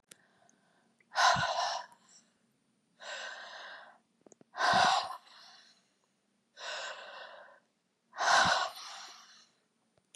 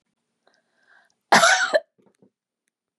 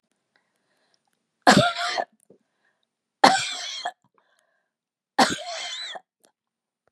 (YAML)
exhalation_length: 10.2 s
exhalation_amplitude: 7948
exhalation_signal_mean_std_ratio: 0.39
cough_length: 3.0 s
cough_amplitude: 28553
cough_signal_mean_std_ratio: 0.29
three_cough_length: 6.9 s
three_cough_amplitude: 31887
three_cough_signal_mean_std_ratio: 0.3
survey_phase: beta (2021-08-13 to 2022-03-07)
age: 65+
gender: Female
wearing_mask: 'No'
symptom_none: true
smoker_status: Ex-smoker
respiratory_condition_asthma: false
respiratory_condition_other: false
recruitment_source: REACT
submission_delay: 6 days
covid_test_result: Negative
covid_test_method: RT-qPCR
influenza_a_test_result: Negative
influenza_b_test_result: Negative